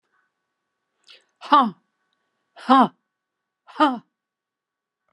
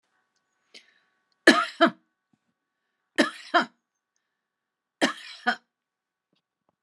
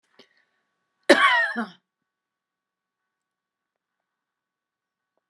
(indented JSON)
{
  "exhalation_length": "5.1 s",
  "exhalation_amplitude": 28456,
  "exhalation_signal_mean_std_ratio": 0.25,
  "three_cough_length": "6.8 s",
  "three_cough_amplitude": 27019,
  "three_cough_signal_mean_std_ratio": 0.23,
  "cough_length": "5.3 s",
  "cough_amplitude": 28937,
  "cough_signal_mean_std_ratio": 0.22,
  "survey_phase": "beta (2021-08-13 to 2022-03-07)",
  "age": "65+",
  "gender": "Female",
  "wearing_mask": "No",
  "symptom_none": true,
  "smoker_status": "Never smoked",
  "respiratory_condition_asthma": false,
  "respiratory_condition_other": false,
  "recruitment_source": "REACT",
  "submission_delay": "1 day",
  "covid_test_result": "Negative",
  "covid_test_method": "RT-qPCR"
}